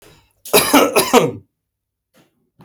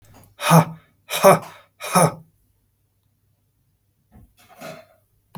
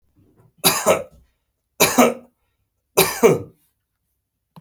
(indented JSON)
{
  "cough_length": "2.6 s",
  "cough_amplitude": 32768,
  "cough_signal_mean_std_ratio": 0.41,
  "exhalation_length": "5.4 s",
  "exhalation_amplitude": 31672,
  "exhalation_signal_mean_std_ratio": 0.28,
  "three_cough_length": "4.6 s",
  "three_cough_amplitude": 32766,
  "three_cough_signal_mean_std_ratio": 0.35,
  "survey_phase": "beta (2021-08-13 to 2022-03-07)",
  "age": "45-64",
  "gender": "Male",
  "wearing_mask": "No",
  "symptom_fatigue": true,
  "symptom_onset": "5 days",
  "smoker_status": "Ex-smoker",
  "respiratory_condition_asthma": false,
  "respiratory_condition_other": false,
  "recruitment_source": "REACT",
  "submission_delay": "1 day",
  "covid_test_result": "Negative",
  "covid_test_method": "RT-qPCR",
  "influenza_a_test_result": "Negative",
  "influenza_b_test_result": "Negative"
}